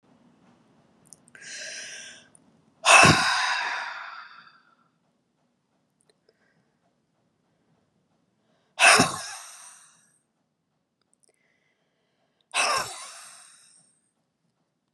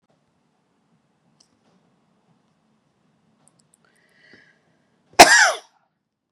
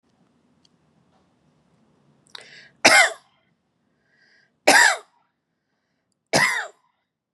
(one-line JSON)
{"exhalation_length": "14.9 s", "exhalation_amplitude": 28572, "exhalation_signal_mean_std_ratio": 0.26, "cough_length": "6.3 s", "cough_amplitude": 32768, "cough_signal_mean_std_ratio": 0.17, "three_cough_length": "7.3 s", "three_cough_amplitude": 32516, "three_cough_signal_mean_std_ratio": 0.26, "survey_phase": "beta (2021-08-13 to 2022-03-07)", "age": "45-64", "gender": "Female", "wearing_mask": "No", "symptom_none": true, "smoker_status": "Never smoked", "respiratory_condition_asthma": false, "respiratory_condition_other": false, "recruitment_source": "REACT", "submission_delay": "2 days", "covid_test_result": "Negative", "covid_test_method": "RT-qPCR", "influenza_a_test_result": "Negative", "influenza_b_test_result": "Negative"}